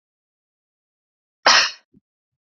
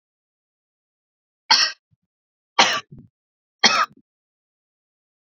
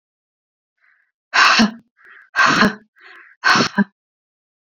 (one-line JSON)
{"cough_length": "2.6 s", "cough_amplitude": 29224, "cough_signal_mean_std_ratio": 0.23, "three_cough_length": "5.3 s", "three_cough_amplitude": 30993, "three_cough_signal_mean_std_ratio": 0.25, "exhalation_length": "4.8 s", "exhalation_amplitude": 32768, "exhalation_signal_mean_std_ratio": 0.39, "survey_phase": "beta (2021-08-13 to 2022-03-07)", "age": "18-44", "gender": "Female", "wearing_mask": "No", "symptom_fatigue": true, "smoker_status": "Never smoked", "respiratory_condition_asthma": false, "respiratory_condition_other": false, "recruitment_source": "REACT", "submission_delay": "1 day", "covid_test_result": "Negative", "covid_test_method": "RT-qPCR"}